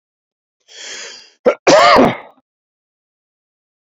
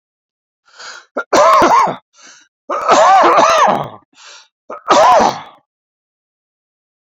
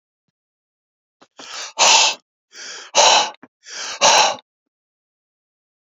{"cough_length": "3.9 s", "cough_amplitude": 29474, "cough_signal_mean_std_ratio": 0.34, "three_cough_length": "7.1 s", "three_cough_amplitude": 29622, "three_cough_signal_mean_std_ratio": 0.51, "exhalation_length": "5.9 s", "exhalation_amplitude": 31807, "exhalation_signal_mean_std_ratio": 0.37, "survey_phase": "beta (2021-08-13 to 2022-03-07)", "age": "45-64", "gender": "Male", "wearing_mask": "No", "symptom_none": true, "smoker_status": "Never smoked", "respiratory_condition_asthma": false, "respiratory_condition_other": false, "recruitment_source": "REACT", "submission_delay": "3 days", "covid_test_result": "Negative", "covid_test_method": "RT-qPCR"}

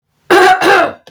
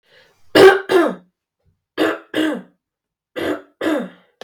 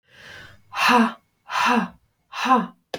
{"cough_length": "1.1 s", "cough_amplitude": 32768, "cough_signal_mean_std_ratio": 0.73, "three_cough_length": "4.4 s", "three_cough_amplitude": 32768, "three_cough_signal_mean_std_ratio": 0.4, "exhalation_length": "3.0 s", "exhalation_amplitude": 21392, "exhalation_signal_mean_std_ratio": 0.5, "survey_phase": "beta (2021-08-13 to 2022-03-07)", "age": "45-64", "gender": "Female", "wearing_mask": "No", "symptom_fatigue": true, "smoker_status": "Never smoked", "respiratory_condition_asthma": false, "respiratory_condition_other": false, "recruitment_source": "REACT", "submission_delay": "1 day", "covid_test_result": "Negative", "covid_test_method": "RT-qPCR"}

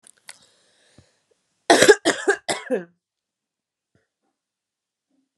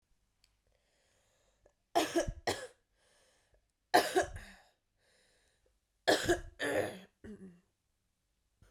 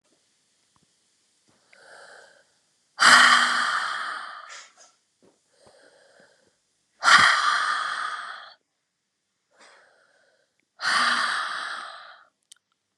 {"cough_length": "5.4 s", "cough_amplitude": 32768, "cough_signal_mean_std_ratio": 0.24, "three_cough_length": "8.7 s", "three_cough_amplitude": 7574, "three_cough_signal_mean_std_ratio": 0.31, "exhalation_length": "13.0 s", "exhalation_amplitude": 29855, "exhalation_signal_mean_std_ratio": 0.36, "survey_phase": "beta (2021-08-13 to 2022-03-07)", "age": "18-44", "gender": "Female", "wearing_mask": "No", "symptom_cough_any": true, "symptom_runny_or_blocked_nose": true, "symptom_fatigue": true, "symptom_fever_high_temperature": true, "symptom_headache": true, "symptom_change_to_sense_of_smell_or_taste": true, "symptom_loss_of_taste": true, "smoker_status": "Never smoked", "respiratory_condition_asthma": false, "respiratory_condition_other": false, "recruitment_source": "Test and Trace", "submission_delay": "1 day", "covid_test_result": "Positive", "covid_test_method": "RT-qPCR", "covid_ct_value": 23.3, "covid_ct_gene": "E gene"}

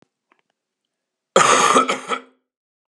{"cough_length": "2.9 s", "cough_amplitude": 32586, "cough_signal_mean_std_ratio": 0.38, "survey_phase": "beta (2021-08-13 to 2022-03-07)", "age": "18-44", "gender": "Male", "wearing_mask": "No", "symptom_cough_any": true, "symptom_runny_or_blocked_nose": true, "symptom_sore_throat": true, "symptom_onset": "13 days", "smoker_status": "Never smoked", "respiratory_condition_asthma": false, "respiratory_condition_other": false, "recruitment_source": "REACT", "submission_delay": "2 days", "covid_test_result": "Negative", "covid_test_method": "RT-qPCR", "influenza_a_test_result": "Negative", "influenza_b_test_result": "Negative"}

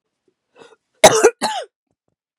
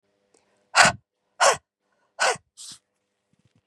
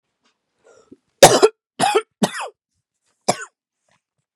{"cough_length": "2.4 s", "cough_amplitude": 32768, "cough_signal_mean_std_ratio": 0.29, "exhalation_length": "3.7 s", "exhalation_amplitude": 30471, "exhalation_signal_mean_std_ratio": 0.28, "three_cough_length": "4.4 s", "three_cough_amplitude": 32768, "three_cough_signal_mean_std_ratio": 0.26, "survey_phase": "beta (2021-08-13 to 2022-03-07)", "age": "18-44", "gender": "Female", "wearing_mask": "No", "symptom_cough_any": true, "symptom_sore_throat": true, "smoker_status": "Never smoked", "respiratory_condition_asthma": false, "respiratory_condition_other": false, "recruitment_source": "Test and Trace", "submission_delay": "7 days", "covid_test_result": "Negative", "covid_test_method": "LFT"}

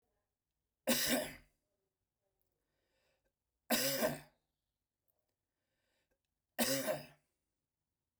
{"three_cough_length": "8.2 s", "three_cough_amplitude": 3919, "three_cough_signal_mean_std_ratio": 0.32, "survey_phase": "beta (2021-08-13 to 2022-03-07)", "age": "45-64", "gender": "Male", "wearing_mask": "No", "symptom_none": true, "smoker_status": "Never smoked", "respiratory_condition_asthma": false, "respiratory_condition_other": false, "recruitment_source": "REACT", "submission_delay": "1 day", "covid_test_result": "Negative", "covid_test_method": "RT-qPCR"}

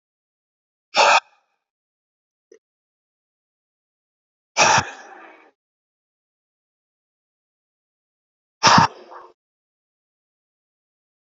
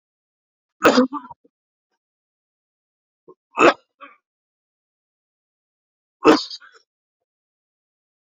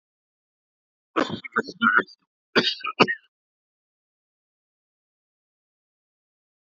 {"exhalation_length": "11.3 s", "exhalation_amplitude": 32767, "exhalation_signal_mean_std_ratio": 0.21, "three_cough_length": "8.3 s", "three_cough_amplitude": 29075, "three_cough_signal_mean_std_ratio": 0.2, "cough_length": "6.7 s", "cough_amplitude": 25576, "cough_signal_mean_std_ratio": 0.25, "survey_phase": "beta (2021-08-13 to 2022-03-07)", "age": "45-64", "gender": "Male", "wearing_mask": "No", "symptom_cough_any": true, "symptom_runny_or_blocked_nose": true, "symptom_fatigue": true, "symptom_headache": true, "symptom_onset": "12 days", "smoker_status": "Ex-smoker", "respiratory_condition_asthma": false, "respiratory_condition_other": false, "recruitment_source": "REACT", "submission_delay": "3 days", "covid_test_result": "Negative", "covid_test_method": "RT-qPCR", "influenza_a_test_result": "Negative", "influenza_b_test_result": "Negative"}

